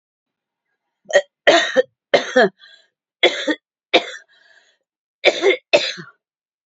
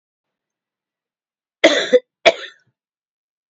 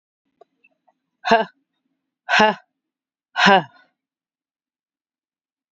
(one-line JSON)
{"three_cough_length": "6.7 s", "three_cough_amplitude": 29327, "three_cough_signal_mean_std_ratio": 0.35, "cough_length": "3.5 s", "cough_amplitude": 30653, "cough_signal_mean_std_ratio": 0.24, "exhalation_length": "5.7 s", "exhalation_amplitude": 28797, "exhalation_signal_mean_std_ratio": 0.25, "survey_phase": "alpha (2021-03-01 to 2021-08-12)", "age": "65+", "gender": "Female", "wearing_mask": "No", "symptom_cough_any": true, "smoker_status": "Never smoked", "respiratory_condition_asthma": false, "respiratory_condition_other": false, "recruitment_source": "REACT", "submission_delay": "2 days", "covid_test_result": "Negative", "covid_test_method": "RT-qPCR"}